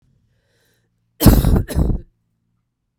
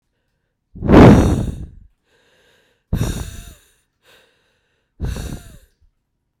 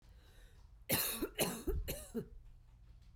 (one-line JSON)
{"cough_length": "3.0 s", "cough_amplitude": 32768, "cough_signal_mean_std_ratio": 0.36, "exhalation_length": "6.4 s", "exhalation_amplitude": 32768, "exhalation_signal_mean_std_ratio": 0.3, "three_cough_length": "3.2 s", "three_cough_amplitude": 3104, "three_cough_signal_mean_std_ratio": 0.57, "survey_phase": "beta (2021-08-13 to 2022-03-07)", "age": "45-64", "gender": "Female", "wearing_mask": "No", "symptom_cough_any": true, "symptom_runny_or_blocked_nose": true, "symptom_fatigue": true, "symptom_loss_of_taste": true, "symptom_onset": "3 days", "smoker_status": "Never smoked", "respiratory_condition_asthma": false, "respiratory_condition_other": false, "recruitment_source": "Test and Trace", "submission_delay": "1 day", "covid_test_result": "Positive", "covid_test_method": "RT-qPCR", "covid_ct_value": 24.1, "covid_ct_gene": "ORF1ab gene"}